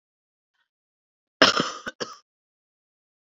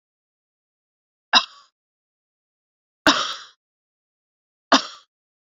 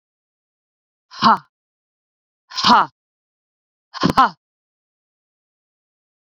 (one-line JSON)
{"cough_length": "3.3 s", "cough_amplitude": 32767, "cough_signal_mean_std_ratio": 0.21, "three_cough_length": "5.5 s", "three_cough_amplitude": 30641, "three_cough_signal_mean_std_ratio": 0.2, "exhalation_length": "6.4 s", "exhalation_amplitude": 27882, "exhalation_signal_mean_std_ratio": 0.24, "survey_phase": "beta (2021-08-13 to 2022-03-07)", "age": "45-64", "gender": "Female", "wearing_mask": "No", "symptom_cough_any": true, "symptom_runny_or_blocked_nose": true, "symptom_abdominal_pain": true, "symptom_fatigue": true, "symptom_headache": true, "symptom_other": true, "symptom_onset": "3 days", "smoker_status": "Never smoked", "respiratory_condition_asthma": false, "respiratory_condition_other": false, "recruitment_source": "Test and Trace", "submission_delay": "1 day", "covid_test_result": "Positive", "covid_test_method": "RT-qPCR", "covid_ct_value": 15.5, "covid_ct_gene": "ORF1ab gene", "covid_ct_mean": 15.8, "covid_viral_load": "6300000 copies/ml", "covid_viral_load_category": "High viral load (>1M copies/ml)"}